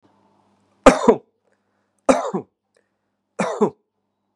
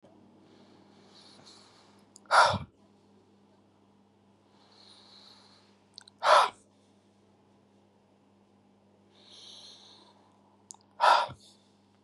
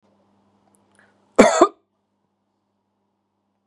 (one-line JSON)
{"three_cough_length": "4.4 s", "three_cough_amplitude": 32768, "three_cough_signal_mean_std_ratio": 0.26, "exhalation_length": "12.0 s", "exhalation_amplitude": 13539, "exhalation_signal_mean_std_ratio": 0.23, "cough_length": "3.7 s", "cough_amplitude": 32768, "cough_signal_mean_std_ratio": 0.2, "survey_phase": "beta (2021-08-13 to 2022-03-07)", "age": "45-64", "gender": "Male", "wearing_mask": "No", "symptom_none": true, "smoker_status": "Never smoked", "respiratory_condition_asthma": false, "respiratory_condition_other": false, "recruitment_source": "REACT", "submission_delay": "1 day", "covid_test_result": "Negative", "covid_test_method": "RT-qPCR"}